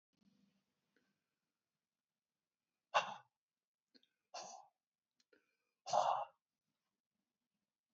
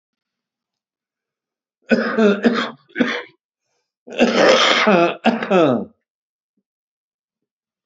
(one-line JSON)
{"exhalation_length": "7.9 s", "exhalation_amplitude": 3726, "exhalation_signal_mean_std_ratio": 0.21, "cough_length": "7.9 s", "cough_amplitude": 28894, "cough_signal_mean_std_ratio": 0.44, "survey_phase": "beta (2021-08-13 to 2022-03-07)", "age": "65+", "gender": "Male", "wearing_mask": "No", "symptom_runny_or_blocked_nose": true, "symptom_fatigue": true, "symptom_onset": "11 days", "smoker_status": "Ex-smoker", "respiratory_condition_asthma": false, "respiratory_condition_other": true, "recruitment_source": "REACT", "submission_delay": "1 day", "covid_test_result": "Negative", "covid_test_method": "RT-qPCR", "covid_ct_value": 38.0, "covid_ct_gene": "N gene"}